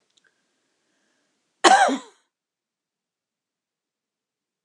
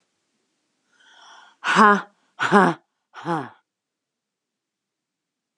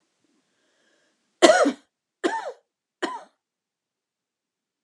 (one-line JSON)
{"cough_length": "4.6 s", "cough_amplitude": 31846, "cough_signal_mean_std_ratio": 0.2, "exhalation_length": "5.6 s", "exhalation_amplitude": 31568, "exhalation_signal_mean_std_ratio": 0.27, "three_cough_length": "4.8 s", "three_cough_amplitude": 32767, "three_cough_signal_mean_std_ratio": 0.24, "survey_phase": "beta (2021-08-13 to 2022-03-07)", "age": "45-64", "gender": "Female", "wearing_mask": "No", "symptom_none": true, "smoker_status": "Ex-smoker", "respiratory_condition_asthma": false, "respiratory_condition_other": false, "recruitment_source": "REACT", "submission_delay": "1 day", "covid_test_result": "Negative", "covid_test_method": "RT-qPCR"}